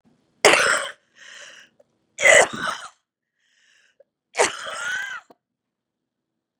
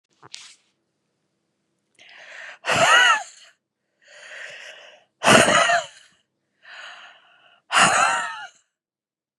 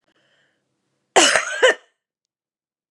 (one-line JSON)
{"three_cough_length": "6.6 s", "three_cough_amplitude": 32767, "three_cough_signal_mean_std_ratio": 0.32, "exhalation_length": "9.4 s", "exhalation_amplitude": 32767, "exhalation_signal_mean_std_ratio": 0.37, "cough_length": "2.9 s", "cough_amplitude": 32767, "cough_signal_mean_std_ratio": 0.31, "survey_phase": "beta (2021-08-13 to 2022-03-07)", "age": "45-64", "gender": "Female", "wearing_mask": "No", "symptom_cough_any": true, "symptom_new_continuous_cough": true, "symptom_runny_or_blocked_nose": true, "symptom_fatigue": true, "symptom_onset": "12 days", "smoker_status": "Ex-smoker", "respiratory_condition_asthma": false, "respiratory_condition_other": false, "recruitment_source": "REACT", "submission_delay": "1 day", "covid_test_result": "Negative", "covid_test_method": "RT-qPCR", "influenza_a_test_result": "Negative", "influenza_b_test_result": "Negative"}